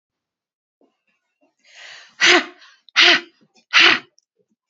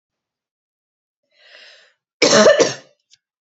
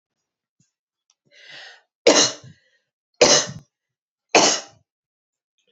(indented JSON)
{
  "exhalation_length": "4.7 s",
  "exhalation_amplitude": 32767,
  "exhalation_signal_mean_std_ratio": 0.31,
  "cough_length": "3.5 s",
  "cough_amplitude": 30142,
  "cough_signal_mean_std_ratio": 0.31,
  "three_cough_length": "5.7 s",
  "three_cough_amplitude": 29784,
  "three_cough_signal_mean_std_ratio": 0.28,
  "survey_phase": "beta (2021-08-13 to 2022-03-07)",
  "age": "18-44",
  "gender": "Female",
  "wearing_mask": "No",
  "symptom_none": true,
  "smoker_status": "Never smoked",
  "respiratory_condition_asthma": true,
  "respiratory_condition_other": false,
  "recruitment_source": "REACT",
  "submission_delay": "1 day",
  "covid_test_result": "Negative",
  "covid_test_method": "RT-qPCR",
  "influenza_a_test_result": "Negative",
  "influenza_b_test_result": "Negative"
}